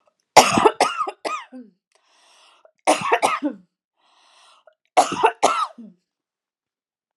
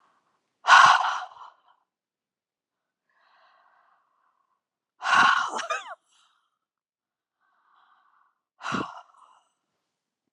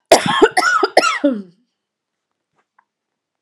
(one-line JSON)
{"three_cough_length": "7.2 s", "three_cough_amplitude": 32768, "three_cough_signal_mean_std_ratio": 0.35, "exhalation_length": "10.3 s", "exhalation_amplitude": 26176, "exhalation_signal_mean_std_ratio": 0.25, "cough_length": "3.4 s", "cough_amplitude": 32768, "cough_signal_mean_std_ratio": 0.41, "survey_phase": "beta (2021-08-13 to 2022-03-07)", "age": "45-64", "gender": "Female", "wearing_mask": "No", "symptom_none": true, "smoker_status": "Never smoked", "respiratory_condition_asthma": false, "respiratory_condition_other": false, "recruitment_source": "REACT", "submission_delay": "1 day", "covid_test_result": "Negative", "covid_test_method": "RT-qPCR"}